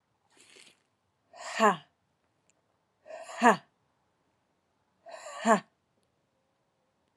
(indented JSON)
{
  "exhalation_length": "7.2 s",
  "exhalation_amplitude": 17138,
  "exhalation_signal_mean_std_ratio": 0.22,
  "survey_phase": "alpha (2021-03-01 to 2021-08-12)",
  "age": "18-44",
  "gender": "Female",
  "wearing_mask": "No",
  "symptom_cough_any": true,
  "symptom_fatigue": true,
  "symptom_headache": true,
  "symptom_change_to_sense_of_smell_or_taste": true,
  "smoker_status": "Ex-smoker",
  "respiratory_condition_asthma": false,
  "respiratory_condition_other": false,
  "recruitment_source": "Test and Trace",
  "submission_delay": "2 days",
  "covid_test_result": "Positive",
  "covid_test_method": "RT-qPCR",
  "covid_ct_value": 22.7,
  "covid_ct_gene": "ORF1ab gene",
  "covid_ct_mean": 23.0,
  "covid_viral_load": "30000 copies/ml",
  "covid_viral_load_category": "Low viral load (10K-1M copies/ml)"
}